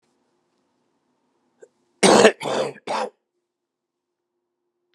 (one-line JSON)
{"cough_length": "4.9 s", "cough_amplitude": 31205, "cough_signal_mean_std_ratio": 0.26, "survey_phase": "beta (2021-08-13 to 2022-03-07)", "age": "65+", "gender": "Male", "wearing_mask": "No", "symptom_cough_any": true, "symptom_onset": "4 days", "smoker_status": "Never smoked", "respiratory_condition_asthma": false, "respiratory_condition_other": false, "recruitment_source": "Test and Trace", "submission_delay": "2 days", "covid_test_result": "Positive", "covid_test_method": "RT-qPCR", "covid_ct_value": 15.3, "covid_ct_gene": "ORF1ab gene", "covid_ct_mean": 15.6, "covid_viral_load": "7600000 copies/ml", "covid_viral_load_category": "High viral load (>1M copies/ml)"}